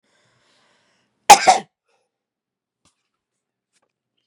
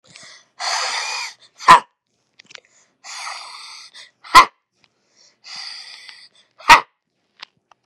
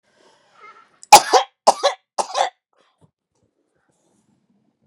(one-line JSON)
{"cough_length": "4.3 s", "cough_amplitude": 32768, "cough_signal_mean_std_ratio": 0.16, "exhalation_length": "7.9 s", "exhalation_amplitude": 32768, "exhalation_signal_mean_std_ratio": 0.24, "three_cough_length": "4.9 s", "three_cough_amplitude": 32768, "three_cough_signal_mean_std_ratio": 0.22, "survey_phase": "beta (2021-08-13 to 2022-03-07)", "age": "45-64", "gender": "Female", "wearing_mask": "No", "symptom_cough_any": true, "symptom_fatigue": true, "symptom_fever_high_temperature": true, "symptom_headache": true, "symptom_loss_of_taste": true, "symptom_onset": "6 days", "smoker_status": "Never smoked", "respiratory_condition_asthma": false, "respiratory_condition_other": false, "recruitment_source": "Test and Trace", "submission_delay": "1 day", "covid_test_result": "Positive", "covid_test_method": "RT-qPCR", "covid_ct_value": 15.9, "covid_ct_gene": "N gene"}